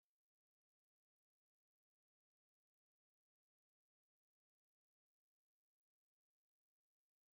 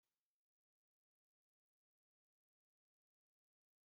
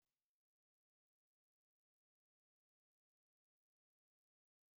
{"three_cough_length": "7.3 s", "three_cough_amplitude": 1, "three_cough_signal_mean_std_ratio": 0.04, "cough_length": "3.8 s", "cough_amplitude": 3, "cough_signal_mean_std_ratio": 0.11, "exhalation_length": "4.8 s", "exhalation_amplitude": 4, "exhalation_signal_mean_std_ratio": 0.1, "survey_phase": "beta (2021-08-13 to 2022-03-07)", "age": "65+", "gender": "Female", "wearing_mask": "No", "symptom_none": true, "smoker_status": "Ex-smoker", "respiratory_condition_asthma": false, "respiratory_condition_other": false, "recruitment_source": "REACT", "submission_delay": "8 days", "covid_test_result": "Negative", "covid_test_method": "RT-qPCR", "influenza_a_test_result": "Negative", "influenza_b_test_result": "Negative"}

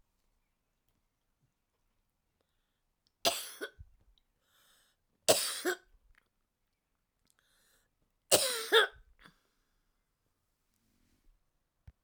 {"three_cough_length": "12.0 s", "three_cough_amplitude": 12071, "three_cough_signal_mean_std_ratio": 0.21, "survey_phase": "alpha (2021-03-01 to 2021-08-12)", "age": "65+", "gender": "Female", "wearing_mask": "No", "symptom_cough_any": true, "symptom_fatigue": true, "symptom_headache": true, "smoker_status": "Never smoked", "respiratory_condition_asthma": true, "respiratory_condition_other": false, "recruitment_source": "REACT", "submission_delay": "3 days", "covid_test_result": "Negative", "covid_test_method": "RT-qPCR"}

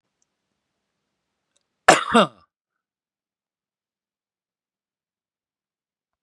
{"cough_length": "6.2 s", "cough_amplitude": 32768, "cough_signal_mean_std_ratio": 0.15, "survey_phase": "beta (2021-08-13 to 2022-03-07)", "age": "65+", "gender": "Male", "wearing_mask": "No", "symptom_none": true, "smoker_status": "Ex-smoker", "respiratory_condition_asthma": false, "respiratory_condition_other": false, "recruitment_source": "REACT", "submission_delay": "1 day", "covid_test_result": "Negative", "covid_test_method": "RT-qPCR", "influenza_a_test_result": "Negative", "influenza_b_test_result": "Negative"}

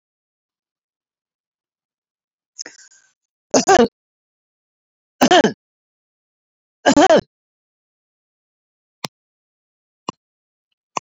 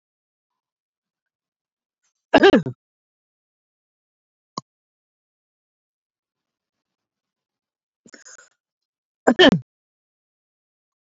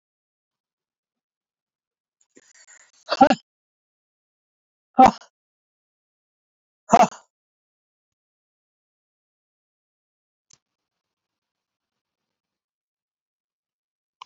{"three_cough_length": "11.0 s", "three_cough_amplitude": 28601, "three_cough_signal_mean_std_ratio": 0.23, "cough_length": "11.0 s", "cough_amplitude": 27562, "cough_signal_mean_std_ratio": 0.17, "exhalation_length": "14.3 s", "exhalation_amplitude": 27685, "exhalation_signal_mean_std_ratio": 0.13, "survey_phase": "beta (2021-08-13 to 2022-03-07)", "age": "65+", "gender": "Male", "wearing_mask": "No", "symptom_none": true, "smoker_status": "Never smoked", "respiratory_condition_asthma": false, "respiratory_condition_other": false, "recruitment_source": "REACT", "submission_delay": "6 days", "covid_test_result": "Negative", "covid_test_method": "RT-qPCR", "influenza_a_test_result": "Negative", "influenza_b_test_result": "Negative"}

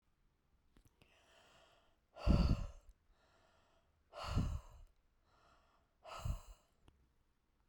{"exhalation_length": "7.7 s", "exhalation_amplitude": 3571, "exhalation_signal_mean_std_ratio": 0.29, "survey_phase": "beta (2021-08-13 to 2022-03-07)", "age": "45-64", "gender": "Female", "wearing_mask": "No", "symptom_sore_throat": true, "smoker_status": "Never smoked", "respiratory_condition_asthma": true, "respiratory_condition_other": false, "recruitment_source": "REACT", "submission_delay": "5 days", "covid_test_result": "Negative", "covid_test_method": "RT-qPCR"}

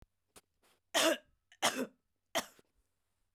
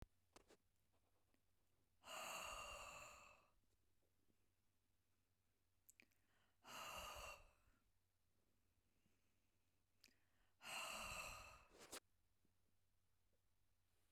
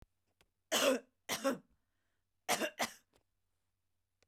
{"three_cough_length": "3.3 s", "three_cough_amplitude": 5906, "three_cough_signal_mean_std_ratio": 0.31, "exhalation_length": "14.1 s", "exhalation_amplitude": 338, "exhalation_signal_mean_std_ratio": 0.46, "cough_length": "4.3 s", "cough_amplitude": 4339, "cough_signal_mean_std_ratio": 0.34, "survey_phase": "beta (2021-08-13 to 2022-03-07)", "age": "45-64", "gender": "Female", "wearing_mask": "No", "symptom_runny_or_blocked_nose": true, "symptom_shortness_of_breath": true, "symptom_fatigue": true, "smoker_status": "Never smoked", "respiratory_condition_asthma": true, "respiratory_condition_other": false, "recruitment_source": "REACT", "submission_delay": "4 days", "covid_test_result": "Negative", "covid_test_method": "RT-qPCR", "influenza_a_test_result": "Negative", "influenza_b_test_result": "Negative"}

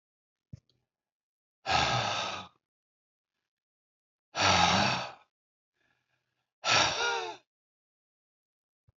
{"exhalation_length": "9.0 s", "exhalation_amplitude": 9358, "exhalation_signal_mean_std_ratio": 0.38, "survey_phase": "alpha (2021-03-01 to 2021-08-12)", "age": "65+", "gender": "Male", "wearing_mask": "No", "symptom_none": true, "smoker_status": "Never smoked", "respiratory_condition_asthma": false, "respiratory_condition_other": false, "recruitment_source": "REACT", "submission_delay": "2 days", "covid_test_result": "Negative", "covid_test_method": "RT-qPCR"}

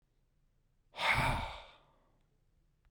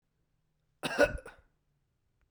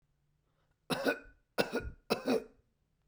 {"exhalation_length": "2.9 s", "exhalation_amplitude": 3846, "exhalation_signal_mean_std_ratio": 0.37, "cough_length": "2.3 s", "cough_amplitude": 8206, "cough_signal_mean_std_ratio": 0.25, "three_cough_length": "3.1 s", "three_cough_amplitude": 7683, "three_cough_signal_mean_std_ratio": 0.39, "survey_phase": "beta (2021-08-13 to 2022-03-07)", "age": "45-64", "gender": "Male", "wearing_mask": "No", "symptom_none": true, "smoker_status": "Never smoked", "respiratory_condition_asthma": false, "respiratory_condition_other": false, "recruitment_source": "REACT", "submission_delay": "3 days", "covid_test_result": "Negative", "covid_test_method": "RT-qPCR", "influenza_a_test_result": "Negative", "influenza_b_test_result": "Negative"}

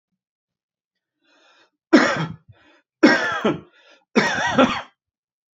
{"three_cough_length": "5.5 s", "three_cough_amplitude": 27602, "three_cough_signal_mean_std_ratio": 0.37, "survey_phase": "beta (2021-08-13 to 2022-03-07)", "age": "18-44", "gender": "Male", "wearing_mask": "No", "symptom_none": true, "smoker_status": "Never smoked", "respiratory_condition_asthma": false, "respiratory_condition_other": false, "recruitment_source": "REACT", "submission_delay": "1 day", "covid_test_result": "Negative", "covid_test_method": "RT-qPCR"}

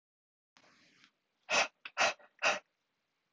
{"exhalation_length": "3.3 s", "exhalation_amplitude": 5175, "exhalation_signal_mean_std_ratio": 0.3, "survey_phase": "alpha (2021-03-01 to 2021-08-12)", "age": "18-44", "gender": "Male", "wearing_mask": "No", "symptom_cough_any": true, "symptom_diarrhoea": true, "symptom_fatigue": true, "symptom_fever_high_temperature": true, "symptom_headache": true, "symptom_change_to_sense_of_smell_or_taste": true, "symptom_loss_of_taste": true, "smoker_status": "Never smoked", "respiratory_condition_asthma": false, "respiratory_condition_other": false, "recruitment_source": "Test and Trace", "submission_delay": "2 days", "covid_test_result": "Positive", "covid_test_method": "RT-qPCR", "covid_ct_value": 26.0, "covid_ct_gene": "ORF1ab gene", "covid_ct_mean": 26.4, "covid_viral_load": "2100 copies/ml", "covid_viral_load_category": "Minimal viral load (< 10K copies/ml)"}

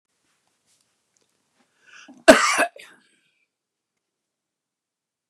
{"cough_length": "5.3 s", "cough_amplitude": 32768, "cough_signal_mean_std_ratio": 0.18, "survey_phase": "beta (2021-08-13 to 2022-03-07)", "age": "65+", "gender": "Male", "wearing_mask": "No", "symptom_none": true, "smoker_status": "Ex-smoker", "respiratory_condition_asthma": false, "respiratory_condition_other": false, "recruitment_source": "REACT", "submission_delay": "4 days", "covid_test_result": "Negative", "covid_test_method": "RT-qPCR", "influenza_a_test_result": "Negative", "influenza_b_test_result": "Negative"}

